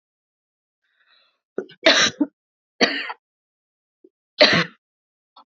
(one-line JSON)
{"three_cough_length": "5.5 s", "three_cough_amplitude": 28839, "three_cough_signal_mean_std_ratio": 0.28, "survey_phase": "beta (2021-08-13 to 2022-03-07)", "age": "18-44", "gender": "Female", "wearing_mask": "No", "symptom_cough_any": true, "symptom_sore_throat": true, "symptom_fatigue": true, "symptom_headache": true, "symptom_onset": "3 days", "smoker_status": "Never smoked", "respiratory_condition_asthma": false, "respiratory_condition_other": false, "recruitment_source": "Test and Trace", "submission_delay": "2 days", "covid_test_result": "Positive", "covid_test_method": "RT-qPCR", "covid_ct_value": 30.2, "covid_ct_gene": "ORF1ab gene", "covid_ct_mean": 30.2, "covid_viral_load": "120 copies/ml", "covid_viral_load_category": "Minimal viral load (< 10K copies/ml)"}